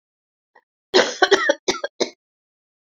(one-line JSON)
{"cough_length": "2.8 s", "cough_amplitude": 27613, "cough_signal_mean_std_ratio": 0.34, "survey_phase": "beta (2021-08-13 to 2022-03-07)", "age": "45-64", "gender": "Female", "wearing_mask": "No", "symptom_cough_any": true, "symptom_runny_or_blocked_nose": true, "symptom_sore_throat": true, "symptom_fatigue": true, "symptom_fever_high_temperature": true, "symptom_headache": true, "smoker_status": "Prefer not to say", "respiratory_condition_asthma": false, "respiratory_condition_other": true, "recruitment_source": "Test and Trace", "submission_delay": "2 days", "covid_test_result": "Positive", "covid_test_method": "RT-qPCR", "covid_ct_value": 31.2, "covid_ct_gene": "ORF1ab gene"}